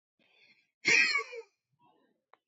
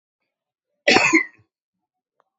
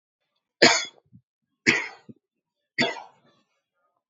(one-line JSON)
{"exhalation_length": "2.5 s", "exhalation_amplitude": 7091, "exhalation_signal_mean_std_ratio": 0.33, "cough_length": "2.4 s", "cough_amplitude": 27264, "cough_signal_mean_std_ratio": 0.3, "three_cough_length": "4.1 s", "three_cough_amplitude": 27648, "three_cough_signal_mean_std_ratio": 0.26, "survey_phase": "beta (2021-08-13 to 2022-03-07)", "age": "18-44", "gender": "Male", "wearing_mask": "No", "symptom_cough_any": true, "symptom_runny_or_blocked_nose": true, "symptom_onset": "4 days", "smoker_status": "Ex-smoker", "respiratory_condition_asthma": false, "respiratory_condition_other": false, "recruitment_source": "REACT", "submission_delay": "2 days", "covid_test_result": "Negative", "covid_test_method": "RT-qPCR", "influenza_a_test_result": "Unknown/Void", "influenza_b_test_result": "Unknown/Void"}